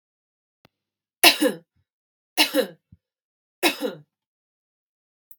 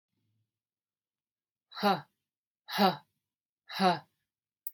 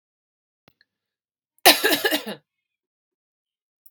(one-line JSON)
{"three_cough_length": "5.4 s", "three_cough_amplitude": 32767, "three_cough_signal_mean_std_ratio": 0.25, "exhalation_length": "4.7 s", "exhalation_amplitude": 8595, "exhalation_signal_mean_std_ratio": 0.28, "cough_length": "3.9 s", "cough_amplitude": 32768, "cough_signal_mean_std_ratio": 0.24, "survey_phase": "beta (2021-08-13 to 2022-03-07)", "age": "18-44", "gender": "Female", "wearing_mask": "No", "symptom_cough_any": true, "symptom_runny_or_blocked_nose": true, "symptom_sore_throat": true, "symptom_diarrhoea": true, "symptom_onset": "6 days", "smoker_status": "Ex-smoker", "respiratory_condition_asthma": false, "respiratory_condition_other": false, "recruitment_source": "REACT", "submission_delay": "4 days", "covid_test_result": "Negative", "covid_test_method": "RT-qPCR", "influenza_a_test_result": "Negative", "influenza_b_test_result": "Negative"}